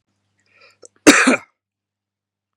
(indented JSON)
{
  "cough_length": "2.6 s",
  "cough_amplitude": 32768,
  "cough_signal_mean_std_ratio": 0.26,
  "survey_phase": "beta (2021-08-13 to 2022-03-07)",
  "age": "18-44",
  "gender": "Male",
  "wearing_mask": "No",
  "symptom_none": true,
  "smoker_status": "Current smoker (11 or more cigarettes per day)",
  "respiratory_condition_asthma": false,
  "respiratory_condition_other": false,
  "recruitment_source": "REACT",
  "submission_delay": "7 days",
  "covid_test_result": "Negative",
  "covid_test_method": "RT-qPCR",
  "influenza_a_test_result": "Negative",
  "influenza_b_test_result": "Negative"
}